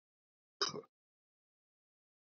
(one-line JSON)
{"cough_length": "2.2 s", "cough_amplitude": 2590, "cough_signal_mean_std_ratio": 0.19, "survey_phase": "beta (2021-08-13 to 2022-03-07)", "age": "45-64", "gender": "Male", "wearing_mask": "No", "symptom_cough_any": true, "symptom_runny_or_blocked_nose": true, "smoker_status": "Never smoked", "respiratory_condition_asthma": false, "respiratory_condition_other": false, "recruitment_source": "Test and Trace", "submission_delay": "2 days", "covid_test_result": "Positive", "covid_test_method": "RT-qPCR", "covid_ct_value": 33.4, "covid_ct_gene": "ORF1ab gene"}